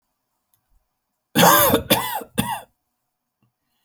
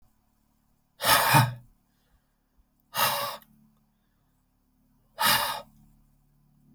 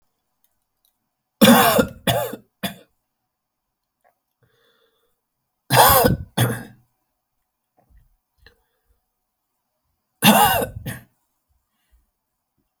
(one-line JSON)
{"cough_length": "3.8 s", "cough_amplitude": 28259, "cough_signal_mean_std_ratio": 0.36, "exhalation_length": "6.7 s", "exhalation_amplitude": 18850, "exhalation_signal_mean_std_ratio": 0.34, "three_cough_length": "12.8 s", "three_cough_amplitude": 32768, "three_cough_signal_mean_std_ratio": 0.3, "survey_phase": "beta (2021-08-13 to 2022-03-07)", "age": "18-44", "gender": "Male", "wearing_mask": "No", "symptom_none": true, "smoker_status": "Never smoked", "respiratory_condition_asthma": false, "respiratory_condition_other": false, "recruitment_source": "REACT", "submission_delay": "0 days", "covid_test_result": "Negative", "covid_test_method": "RT-qPCR"}